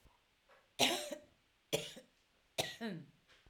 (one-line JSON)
{"three_cough_length": "3.5 s", "three_cough_amplitude": 5786, "three_cough_signal_mean_std_ratio": 0.36, "survey_phase": "alpha (2021-03-01 to 2021-08-12)", "age": "45-64", "gender": "Female", "wearing_mask": "No", "symptom_none": true, "smoker_status": "Current smoker (11 or more cigarettes per day)", "respiratory_condition_asthma": false, "respiratory_condition_other": false, "recruitment_source": "REACT", "submission_delay": "1 day", "covid_test_result": "Negative", "covid_test_method": "RT-qPCR"}